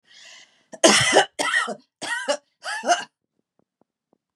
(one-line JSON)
{"cough_length": "4.4 s", "cough_amplitude": 30082, "cough_signal_mean_std_ratio": 0.41, "survey_phase": "beta (2021-08-13 to 2022-03-07)", "age": "45-64", "gender": "Female", "wearing_mask": "No", "symptom_cough_any": true, "symptom_runny_or_blocked_nose": true, "symptom_sore_throat": true, "symptom_fatigue": true, "symptom_headache": true, "smoker_status": "Never smoked", "respiratory_condition_asthma": false, "respiratory_condition_other": false, "recruitment_source": "Test and Trace", "submission_delay": "1 day", "covid_test_result": "Positive", "covid_test_method": "ePCR"}